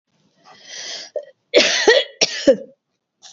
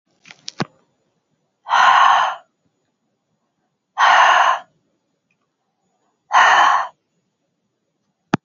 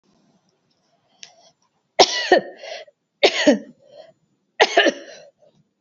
{
  "cough_length": "3.3 s",
  "cough_amplitude": 31367,
  "cough_signal_mean_std_ratio": 0.4,
  "exhalation_length": "8.4 s",
  "exhalation_amplitude": 28747,
  "exhalation_signal_mean_std_ratio": 0.39,
  "three_cough_length": "5.8 s",
  "three_cough_amplitude": 29809,
  "three_cough_signal_mean_std_ratio": 0.31,
  "survey_phase": "beta (2021-08-13 to 2022-03-07)",
  "age": "65+",
  "gender": "Female",
  "wearing_mask": "No",
  "symptom_none": true,
  "smoker_status": "Ex-smoker",
  "respiratory_condition_asthma": false,
  "respiratory_condition_other": false,
  "recruitment_source": "REACT",
  "submission_delay": "2 days",
  "covid_test_result": "Negative",
  "covid_test_method": "RT-qPCR",
  "influenza_a_test_result": "Negative",
  "influenza_b_test_result": "Negative"
}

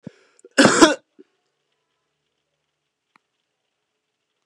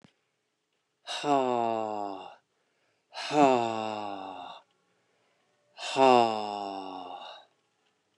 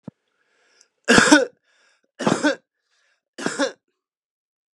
{
  "cough_length": "4.5 s",
  "cough_amplitude": 32768,
  "cough_signal_mean_std_ratio": 0.21,
  "exhalation_length": "8.2 s",
  "exhalation_amplitude": 14222,
  "exhalation_signal_mean_std_ratio": 0.41,
  "three_cough_length": "4.7 s",
  "three_cough_amplitude": 32768,
  "three_cough_signal_mean_std_ratio": 0.31,
  "survey_phase": "beta (2021-08-13 to 2022-03-07)",
  "age": "45-64",
  "gender": "Female",
  "wearing_mask": "No",
  "symptom_runny_or_blocked_nose": true,
  "symptom_sore_throat": true,
  "symptom_fatigue": true,
  "symptom_change_to_sense_of_smell_or_taste": true,
  "symptom_loss_of_taste": true,
  "symptom_onset": "11 days",
  "smoker_status": "Ex-smoker",
  "respiratory_condition_asthma": false,
  "respiratory_condition_other": false,
  "recruitment_source": "Test and Trace",
  "submission_delay": "4 days",
  "covid_test_result": "Positive",
  "covid_test_method": "RT-qPCR",
  "covid_ct_value": 21.7,
  "covid_ct_gene": "ORF1ab gene"
}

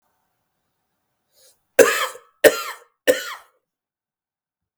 {
  "three_cough_length": "4.8 s",
  "three_cough_amplitude": 32768,
  "three_cough_signal_mean_std_ratio": 0.24,
  "survey_phase": "beta (2021-08-13 to 2022-03-07)",
  "age": "45-64",
  "gender": "Male",
  "wearing_mask": "No",
  "symptom_none": true,
  "smoker_status": "Never smoked",
  "respiratory_condition_asthma": true,
  "respiratory_condition_other": false,
  "recruitment_source": "REACT",
  "submission_delay": "1 day",
  "covid_test_result": "Negative",
  "covid_test_method": "RT-qPCR",
  "influenza_a_test_result": "Negative",
  "influenza_b_test_result": "Negative"
}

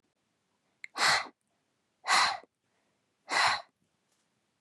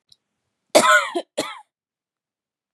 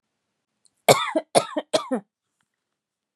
{
  "exhalation_length": "4.6 s",
  "exhalation_amplitude": 7782,
  "exhalation_signal_mean_std_ratio": 0.35,
  "cough_length": "2.7 s",
  "cough_amplitude": 32073,
  "cough_signal_mean_std_ratio": 0.31,
  "three_cough_length": "3.2 s",
  "three_cough_amplitude": 32532,
  "three_cough_signal_mean_std_ratio": 0.29,
  "survey_phase": "beta (2021-08-13 to 2022-03-07)",
  "age": "18-44",
  "gender": "Female",
  "wearing_mask": "No",
  "symptom_none": true,
  "smoker_status": "Never smoked",
  "respiratory_condition_asthma": false,
  "respiratory_condition_other": false,
  "recruitment_source": "REACT",
  "submission_delay": "3 days",
  "covid_test_result": "Negative",
  "covid_test_method": "RT-qPCR",
  "influenza_a_test_result": "Negative",
  "influenza_b_test_result": "Negative"
}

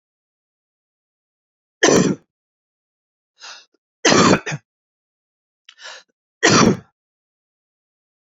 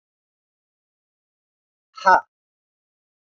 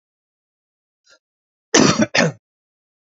{
  "three_cough_length": "8.4 s",
  "three_cough_amplitude": 32768,
  "three_cough_signal_mean_std_ratio": 0.29,
  "exhalation_length": "3.2 s",
  "exhalation_amplitude": 28131,
  "exhalation_signal_mean_std_ratio": 0.16,
  "cough_length": "3.2 s",
  "cough_amplitude": 32406,
  "cough_signal_mean_std_ratio": 0.29,
  "survey_phase": "beta (2021-08-13 to 2022-03-07)",
  "age": "45-64",
  "gender": "Male",
  "wearing_mask": "No",
  "symptom_cough_any": true,
  "symptom_runny_or_blocked_nose": true,
  "symptom_other": true,
  "symptom_onset": "3 days",
  "smoker_status": "Never smoked",
  "respiratory_condition_asthma": false,
  "respiratory_condition_other": false,
  "recruitment_source": "Test and Trace",
  "submission_delay": "1 day",
  "covid_test_result": "Positive",
  "covid_test_method": "RT-qPCR",
  "covid_ct_value": 17.4,
  "covid_ct_gene": "ORF1ab gene",
  "covid_ct_mean": 17.5,
  "covid_viral_load": "1800000 copies/ml",
  "covid_viral_load_category": "High viral load (>1M copies/ml)"
}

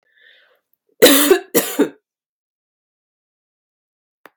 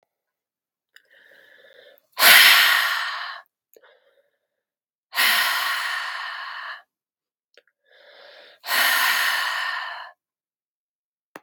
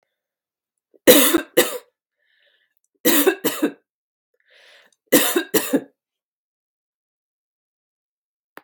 {
  "cough_length": "4.4 s",
  "cough_amplitude": 32768,
  "cough_signal_mean_std_ratio": 0.28,
  "exhalation_length": "11.4 s",
  "exhalation_amplitude": 32768,
  "exhalation_signal_mean_std_ratio": 0.41,
  "three_cough_length": "8.6 s",
  "three_cough_amplitude": 32768,
  "three_cough_signal_mean_std_ratio": 0.3,
  "survey_phase": "beta (2021-08-13 to 2022-03-07)",
  "age": "45-64",
  "gender": "Female",
  "wearing_mask": "Yes",
  "symptom_none": true,
  "smoker_status": "Never smoked",
  "respiratory_condition_asthma": false,
  "respiratory_condition_other": false,
  "recruitment_source": "REACT",
  "submission_delay": "1 day",
  "covid_test_result": "Negative",
  "covid_test_method": "RT-qPCR",
  "influenza_a_test_result": "Unknown/Void",
  "influenza_b_test_result": "Unknown/Void"
}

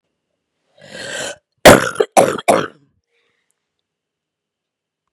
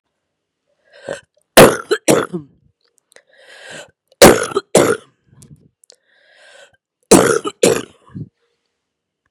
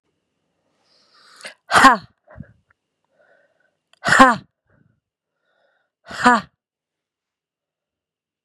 {
  "cough_length": "5.1 s",
  "cough_amplitude": 32768,
  "cough_signal_mean_std_ratio": 0.27,
  "three_cough_length": "9.3 s",
  "three_cough_amplitude": 32768,
  "three_cough_signal_mean_std_ratio": 0.3,
  "exhalation_length": "8.4 s",
  "exhalation_amplitude": 32768,
  "exhalation_signal_mean_std_ratio": 0.23,
  "survey_phase": "beta (2021-08-13 to 2022-03-07)",
  "age": "45-64",
  "gender": "Female",
  "wearing_mask": "No",
  "symptom_cough_any": true,
  "symptom_new_continuous_cough": true,
  "symptom_change_to_sense_of_smell_or_taste": true,
  "symptom_onset": "11 days",
  "smoker_status": "Never smoked",
  "respiratory_condition_asthma": true,
  "respiratory_condition_other": false,
  "recruitment_source": "REACT",
  "submission_delay": "2 days",
  "covid_test_result": "Negative",
  "covid_test_method": "RT-qPCR",
  "influenza_a_test_result": "Negative",
  "influenza_b_test_result": "Negative"
}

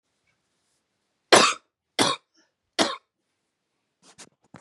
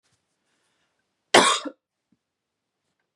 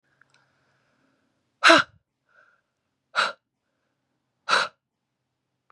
{
  "three_cough_length": "4.6 s",
  "three_cough_amplitude": 32767,
  "three_cough_signal_mean_std_ratio": 0.23,
  "cough_length": "3.2 s",
  "cough_amplitude": 32767,
  "cough_signal_mean_std_ratio": 0.21,
  "exhalation_length": "5.7 s",
  "exhalation_amplitude": 27590,
  "exhalation_signal_mean_std_ratio": 0.21,
  "survey_phase": "beta (2021-08-13 to 2022-03-07)",
  "age": "18-44",
  "gender": "Female",
  "wearing_mask": "No",
  "symptom_runny_or_blocked_nose": true,
  "smoker_status": "Current smoker (e-cigarettes or vapes only)",
  "respiratory_condition_asthma": false,
  "respiratory_condition_other": false,
  "recruitment_source": "REACT",
  "submission_delay": "3 days",
  "covid_test_result": "Negative",
  "covid_test_method": "RT-qPCR",
  "influenza_a_test_result": "Negative",
  "influenza_b_test_result": "Negative"
}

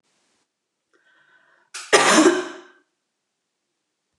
{
  "cough_length": "4.2 s",
  "cough_amplitude": 29203,
  "cough_signal_mean_std_ratio": 0.29,
  "survey_phase": "beta (2021-08-13 to 2022-03-07)",
  "age": "45-64",
  "gender": "Female",
  "wearing_mask": "Yes",
  "symptom_sore_throat": true,
  "symptom_headache": true,
  "smoker_status": "Never smoked",
  "respiratory_condition_asthma": true,
  "respiratory_condition_other": false,
  "recruitment_source": "REACT",
  "submission_delay": "2 days",
  "covid_test_result": "Negative",
  "covid_test_method": "RT-qPCR"
}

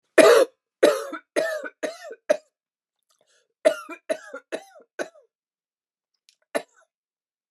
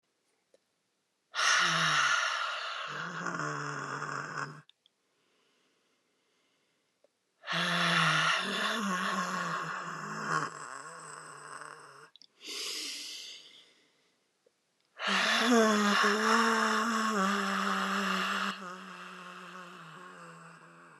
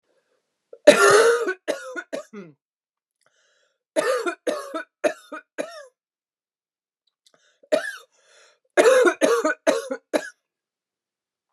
{
  "cough_length": "7.5 s",
  "cough_amplitude": 28944,
  "cough_signal_mean_std_ratio": 0.28,
  "exhalation_length": "21.0 s",
  "exhalation_amplitude": 7898,
  "exhalation_signal_mean_std_ratio": 0.63,
  "three_cough_length": "11.5 s",
  "three_cough_amplitude": 29204,
  "three_cough_signal_mean_std_ratio": 0.36,
  "survey_phase": "alpha (2021-03-01 to 2021-08-12)",
  "age": "45-64",
  "gender": "Female",
  "wearing_mask": "No",
  "symptom_fatigue": true,
  "symptom_change_to_sense_of_smell_or_taste": true,
  "symptom_loss_of_taste": true,
  "symptom_onset": "6 days",
  "smoker_status": "Never smoked",
  "respiratory_condition_asthma": false,
  "respiratory_condition_other": false,
  "recruitment_source": "Test and Trace",
  "submission_delay": "2 days",
  "covid_test_result": "Positive",
  "covid_test_method": "RT-qPCR",
  "covid_ct_value": 28.3,
  "covid_ct_gene": "ORF1ab gene",
  "covid_ct_mean": 28.5,
  "covid_viral_load": "460 copies/ml",
  "covid_viral_load_category": "Minimal viral load (< 10K copies/ml)"
}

